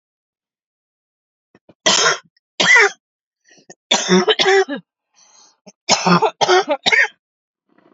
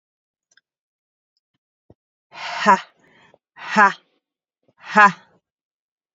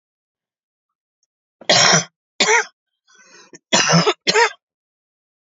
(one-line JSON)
{"three_cough_length": "7.9 s", "three_cough_amplitude": 32767, "three_cough_signal_mean_std_ratio": 0.43, "exhalation_length": "6.1 s", "exhalation_amplitude": 32767, "exhalation_signal_mean_std_ratio": 0.25, "cough_length": "5.5 s", "cough_amplitude": 32767, "cough_signal_mean_std_ratio": 0.38, "survey_phase": "alpha (2021-03-01 to 2021-08-12)", "age": "18-44", "gender": "Female", "wearing_mask": "No", "symptom_none": true, "smoker_status": "Current smoker (11 or more cigarettes per day)", "respiratory_condition_asthma": false, "respiratory_condition_other": false, "recruitment_source": "REACT", "submission_delay": "4 days", "covid_test_result": "Negative", "covid_test_method": "RT-qPCR"}